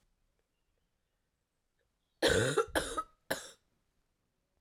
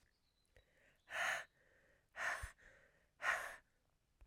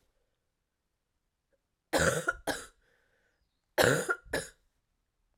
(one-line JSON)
{"three_cough_length": "4.6 s", "three_cough_amplitude": 5724, "three_cough_signal_mean_std_ratio": 0.31, "exhalation_length": "4.3 s", "exhalation_amplitude": 1717, "exhalation_signal_mean_std_ratio": 0.39, "cough_length": "5.4 s", "cough_amplitude": 11558, "cough_signal_mean_std_ratio": 0.31, "survey_phase": "beta (2021-08-13 to 2022-03-07)", "age": "18-44", "gender": "Female", "wearing_mask": "No", "symptom_cough_any": true, "symptom_runny_or_blocked_nose": true, "symptom_sore_throat": true, "symptom_fatigue": true, "symptom_fever_high_temperature": true, "symptom_headache": true, "symptom_onset": "4 days", "smoker_status": "Never smoked", "respiratory_condition_asthma": false, "respiratory_condition_other": false, "recruitment_source": "Test and Trace", "submission_delay": "1 day", "covid_test_result": "Positive", "covid_test_method": "RT-qPCR", "covid_ct_value": 16.5, "covid_ct_gene": "ORF1ab gene", "covid_ct_mean": 16.9, "covid_viral_load": "2900000 copies/ml", "covid_viral_load_category": "High viral load (>1M copies/ml)"}